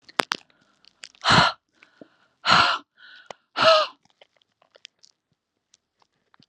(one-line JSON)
{"exhalation_length": "6.5 s", "exhalation_amplitude": 32768, "exhalation_signal_mean_std_ratio": 0.3, "survey_phase": "alpha (2021-03-01 to 2021-08-12)", "age": "18-44", "gender": "Female", "wearing_mask": "No", "symptom_fatigue": true, "symptom_onset": "12 days", "smoker_status": "Never smoked", "respiratory_condition_asthma": true, "respiratory_condition_other": false, "recruitment_source": "REACT", "submission_delay": "1 day", "covid_test_result": "Negative", "covid_test_method": "RT-qPCR"}